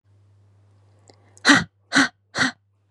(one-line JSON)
{"exhalation_length": "2.9 s", "exhalation_amplitude": 31793, "exhalation_signal_mean_std_ratio": 0.31, "survey_phase": "beta (2021-08-13 to 2022-03-07)", "age": "18-44", "gender": "Female", "wearing_mask": "No", "symptom_none": true, "smoker_status": "Never smoked", "respiratory_condition_asthma": false, "respiratory_condition_other": false, "recruitment_source": "REACT", "submission_delay": "3 days", "covid_test_result": "Negative", "covid_test_method": "RT-qPCR", "influenza_a_test_result": "Unknown/Void", "influenza_b_test_result": "Unknown/Void"}